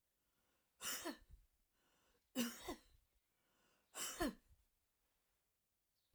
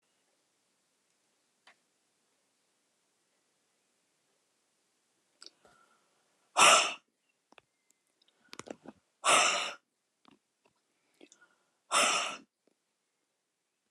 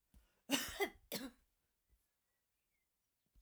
{"three_cough_length": "6.1 s", "three_cough_amplitude": 1397, "three_cough_signal_mean_std_ratio": 0.33, "exhalation_length": "13.9 s", "exhalation_amplitude": 13265, "exhalation_signal_mean_std_ratio": 0.22, "cough_length": "3.4 s", "cough_amplitude": 2457, "cough_signal_mean_std_ratio": 0.29, "survey_phase": "alpha (2021-03-01 to 2021-08-12)", "age": "65+", "gender": "Female", "wearing_mask": "No", "symptom_none": true, "smoker_status": "Never smoked", "respiratory_condition_asthma": false, "respiratory_condition_other": false, "recruitment_source": "REACT", "submission_delay": "1 day", "covid_test_result": "Negative", "covid_test_method": "RT-qPCR"}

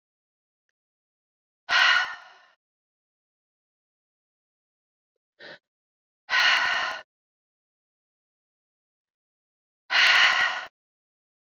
{"exhalation_length": "11.5 s", "exhalation_amplitude": 15324, "exhalation_signal_mean_std_ratio": 0.31, "survey_phase": "beta (2021-08-13 to 2022-03-07)", "age": "45-64", "gender": "Female", "wearing_mask": "No", "symptom_cough_any": true, "symptom_abdominal_pain": true, "symptom_fatigue": true, "symptom_headache": true, "symptom_change_to_sense_of_smell_or_taste": true, "smoker_status": "Never smoked", "respiratory_condition_asthma": true, "respiratory_condition_other": false, "recruitment_source": "Test and Trace", "submission_delay": "2 days", "covid_test_result": "Positive", "covid_test_method": "RT-qPCR"}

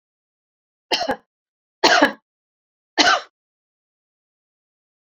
{"three_cough_length": "5.1 s", "three_cough_amplitude": 30433, "three_cough_signal_mean_std_ratio": 0.27, "survey_phase": "beta (2021-08-13 to 2022-03-07)", "age": "45-64", "gender": "Female", "wearing_mask": "No", "symptom_none": true, "smoker_status": "Never smoked", "respiratory_condition_asthma": false, "respiratory_condition_other": false, "recruitment_source": "REACT", "submission_delay": "1 day", "covid_test_result": "Negative", "covid_test_method": "RT-qPCR"}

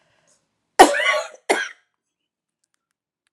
{"three_cough_length": "3.3 s", "three_cough_amplitude": 32768, "three_cough_signal_mean_std_ratio": 0.27, "survey_phase": "alpha (2021-03-01 to 2021-08-12)", "age": "45-64", "gender": "Female", "wearing_mask": "No", "symptom_shortness_of_breath": true, "symptom_diarrhoea": true, "symptom_fatigue": true, "symptom_loss_of_taste": true, "symptom_onset": "9 days", "smoker_status": "Never smoked", "respiratory_condition_asthma": false, "respiratory_condition_other": false, "recruitment_source": "REACT", "submission_delay": "2 days", "covid_test_result": "Negative", "covid_test_method": "RT-qPCR"}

